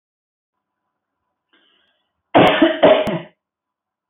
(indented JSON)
{
  "cough_length": "4.1 s",
  "cough_amplitude": 26809,
  "cough_signal_mean_std_ratio": 0.33,
  "survey_phase": "beta (2021-08-13 to 2022-03-07)",
  "age": "65+",
  "gender": "Female",
  "wearing_mask": "No",
  "symptom_none": true,
  "smoker_status": "Ex-smoker",
  "respiratory_condition_asthma": false,
  "respiratory_condition_other": false,
  "recruitment_source": "REACT",
  "submission_delay": "1 day",
  "covid_test_result": "Negative",
  "covid_test_method": "RT-qPCR",
  "influenza_a_test_result": "Negative",
  "influenza_b_test_result": "Negative"
}